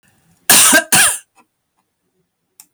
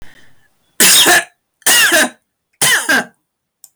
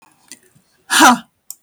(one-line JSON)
{"cough_length": "2.7 s", "cough_amplitude": 32768, "cough_signal_mean_std_ratio": 0.41, "three_cough_length": "3.8 s", "three_cough_amplitude": 32768, "three_cough_signal_mean_std_ratio": 0.56, "exhalation_length": "1.6 s", "exhalation_amplitude": 32768, "exhalation_signal_mean_std_ratio": 0.34, "survey_phase": "beta (2021-08-13 to 2022-03-07)", "age": "45-64", "gender": "Female", "wearing_mask": "No", "symptom_none": true, "symptom_onset": "12 days", "smoker_status": "Never smoked", "respiratory_condition_asthma": false, "respiratory_condition_other": false, "recruitment_source": "REACT", "submission_delay": "6 days", "covid_test_result": "Negative", "covid_test_method": "RT-qPCR", "influenza_a_test_result": "Unknown/Void", "influenza_b_test_result": "Unknown/Void"}